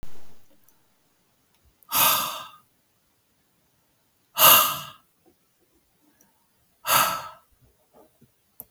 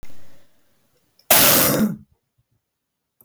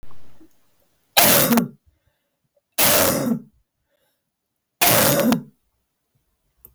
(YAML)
exhalation_length: 8.7 s
exhalation_amplitude: 32101
exhalation_signal_mean_std_ratio: 0.31
cough_length: 3.2 s
cough_amplitude: 32768
cough_signal_mean_std_ratio: 0.42
three_cough_length: 6.7 s
three_cough_amplitude: 32768
three_cough_signal_mean_std_ratio: 0.45
survey_phase: beta (2021-08-13 to 2022-03-07)
age: 45-64
gender: Female
wearing_mask: 'No'
symptom_cough_any: true
symptom_runny_or_blocked_nose: true
symptom_shortness_of_breath: true
symptom_fatigue: true
symptom_fever_high_temperature: true
symptom_headache: true
symptom_onset: 7 days
smoker_status: Ex-smoker
respiratory_condition_asthma: false
respiratory_condition_other: false
recruitment_source: Test and Trace
submission_delay: 1 day
covid_test_result: Positive
covid_test_method: RT-qPCR
covid_ct_value: 18.2
covid_ct_gene: ORF1ab gene
covid_ct_mean: 18.7
covid_viral_load: 740000 copies/ml
covid_viral_load_category: Low viral load (10K-1M copies/ml)